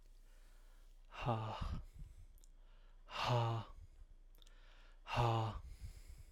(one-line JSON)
{"exhalation_length": "6.3 s", "exhalation_amplitude": 2618, "exhalation_signal_mean_std_ratio": 0.57, "survey_phase": "alpha (2021-03-01 to 2021-08-12)", "age": "18-44", "gender": "Male", "wearing_mask": "No", "symptom_none": true, "smoker_status": "Never smoked", "respiratory_condition_asthma": false, "respiratory_condition_other": false, "recruitment_source": "REACT", "submission_delay": "2 days", "covid_test_result": "Negative", "covid_test_method": "RT-qPCR"}